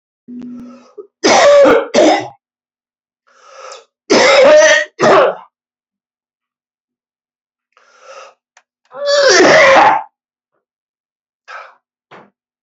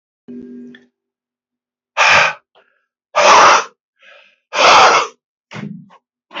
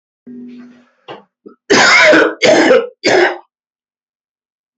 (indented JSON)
{
  "three_cough_length": "12.6 s",
  "three_cough_amplitude": 32768,
  "three_cough_signal_mean_std_ratio": 0.45,
  "exhalation_length": "6.4 s",
  "exhalation_amplitude": 31233,
  "exhalation_signal_mean_std_ratio": 0.41,
  "cough_length": "4.8 s",
  "cough_amplitude": 32768,
  "cough_signal_mean_std_ratio": 0.49,
  "survey_phase": "beta (2021-08-13 to 2022-03-07)",
  "age": "65+",
  "gender": "Male",
  "wearing_mask": "No",
  "symptom_cough_any": true,
  "symptom_diarrhoea": true,
  "symptom_fatigue": true,
  "symptom_headache": true,
  "smoker_status": "Never smoked",
  "respiratory_condition_asthma": false,
  "respiratory_condition_other": false,
  "recruitment_source": "Test and Trace",
  "submission_delay": "1 day",
  "covid_test_result": "Positive",
  "covid_test_method": "RT-qPCR"
}